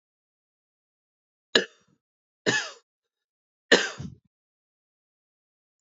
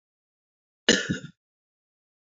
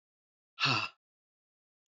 {"three_cough_length": "5.8 s", "three_cough_amplitude": 28688, "three_cough_signal_mean_std_ratio": 0.2, "cough_length": "2.2 s", "cough_amplitude": 27053, "cough_signal_mean_std_ratio": 0.23, "exhalation_length": "1.9 s", "exhalation_amplitude": 5072, "exhalation_signal_mean_std_ratio": 0.3, "survey_phase": "beta (2021-08-13 to 2022-03-07)", "age": "18-44", "gender": "Male", "wearing_mask": "No", "symptom_cough_any": true, "symptom_new_continuous_cough": true, "symptom_runny_or_blocked_nose": true, "symptom_shortness_of_breath": true, "symptom_sore_throat": true, "symptom_fatigue": true, "symptom_fever_high_temperature": true, "symptom_headache": true, "symptom_change_to_sense_of_smell_or_taste": true, "symptom_loss_of_taste": true, "symptom_onset": "3 days", "smoker_status": "Never smoked", "respiratory_condition_asthma": true, "respiratory_condition_other": false, "recruitment_source": "Test and Trace", "submission_delay": "2 days", "covid_test_result": "Positive", "covid_test_method": "RT-qPCR", "covid_ct_value": 15.9, "covid_ct_gene": "ORF1ab gene", "covid_ct_mean": 16.2, "covid_viral_load": "4700000 copies/ml", "covid_viral_load_category": "High viral load (>1M copies/ml)"}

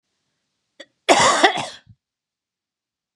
{"cough_length": "3.2 s", "cough_amplitude": 31989, "cough_signal_mean_std_ratio": 0.32, "survey_phase": "beta (2021-08-13 to 2022-03-07)", "age": "45-64", "gender": "Female", "wearing_mask": "No", "symptom_headache": true, "symptom_onset": "13 days", "smoker_status": "Never smoked", "respiratory_condition_asthma": false, "respiratory_condition_other": false, "recruitment_source": "REACT", "submission_delay": "1 day", "covid_test_result": "Negative", "covid_test_method": "RT-qPCR"}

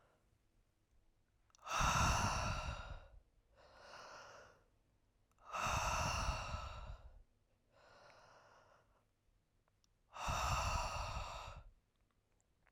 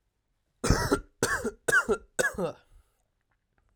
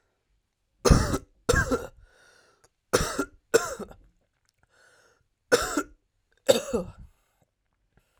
{"exhalation_length": "12.7 s", "exhalation_amplitude": 2566, "exhalation_signal_mean_std_ratio": 0.49, "cough_length": "3.8 s", "cough_amplitude": 14936, "cough_signal_mean_std_ratio": 0.43, "three_cough_length": "8.2 s", "three_cough_amplitude": 22488, "three_cough_signal_mean_std_ratio": 0.32, "survey_phase": "alpha (2021-03-01 to 2021-08-12)", "age": "18-44", "gender": "Male", "wearing_mask": "No", "symptom_loss_of_taste": true, "symptom_onset": "3 days", "smoker_status": "Current smoker (e-cigarettes or vapes only)", "respiratory_condition_asthma": true, "respiratory_condition_other": false, "recruitment_source": "Test and Trace", "submission_delay": "2 days", "covid_test_result": "Positive", "covid_test_method": "RT-qPCR", "covid_ct_value": 16.9, "covid_ct_gene": "ORF1ab gene"}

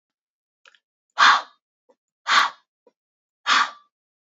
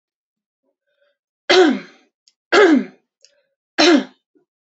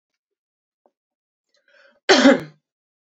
{"exhalation_length": "4.3 s", "exhalation_amplitude": 24410, "exhalation_signal_mean_std_ratio": 0.3, "three_cough_length": "4.8 s", "three_cough_amplitude": 30466, "three_cough_signal_mean_std_ratio": 0.35, "cough_length": "3.1 s", "cough_amplitude": 28281, "cough_signal_mean_std_ratio": 0.24, "survey_phase": "beta (2021-08-13 to 2022-03-07)", "age": "18-44", "gender": "Female", "wearing_mask": "No", "symptom_none": true, "smoker_status": "Never smoked", "respiratory_condition_asthma": false, "respiratory_condition_other": false, "recruitment_source": "REACT", "submission_delay": "1 day", "covid_test_result": "Negative", "covid_test_method": "RT-qPCR"}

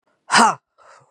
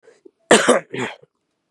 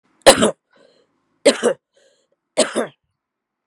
{"exhalation_length": "1.1 s", "exhalation_amplitude": 32767, "exhalation_signal_mean_std_ratio": 0.36, "cough_length": "1.7 s", "cough_amplitude": 32768, "cough_signal_mean_std_ratio": 0.35, "three_cough_length": "3.7 s", "three_cough_amplitude": 32768, "three_cough_signal_mean_std_ratio": 0.29, "survey_phase": "beta (2021-08-13 to 2022-03-07)", "age": "18-44", "gender": "Female", "wearing_mask": "Yes", "symptom_runny_or_blocked_nose": true, "symptom_sore_throat": true, "symptom_fatigue": true, "symptom_headache": true, "symptom_onset": "3 days", "smoker_status": "Current smoker (1 to 10 cigarettes per day)", "respiratory_condition_asthma": false, "respiratory_condition_other": false, "recruitment_source": "Test and Trace", "submission_delay": "1 day", "covid_test_result": "Positive", "covid_test_method": "RT-qPCR", "covid_ct_value": 23.5, "covid_ct_gene": "N gene"}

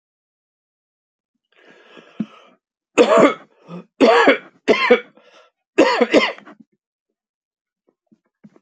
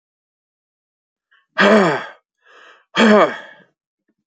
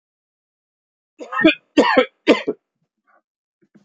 {"three_cough_length": "8.6 s", "three_cough_amplitude": 28185, "three_cough_signal_mean_std_ratio": 0.34, "exhalation_length": "4.3 s", "exhalation_amplitude": 31859, "exhalation_signal_mean_std_ratio": 0.35, "cough_length": "3.8 s", "cough_amplitude": 27343, "cough_signal_mean_std_ratio": 0.31, "survey_phase": "beta (2021-08-13 to 2022-03-07)", "age": "45-64", "gender": "Male", "wearing_mask": "No", "symptom_cough_any": true, "symptom_runny_or_blocked_nose": true, "symptom_fatigue": true, "symptom_onset": "8 days", "smoker_status": "Never smoked", "respiratory_condition_asthma": false, "respiratory_condition_other": false, "recruitment_source": "Test and Trace", "submission_delay": "1 day", "covid_test_result": "Positive", "covid_test_method": "ePCR"}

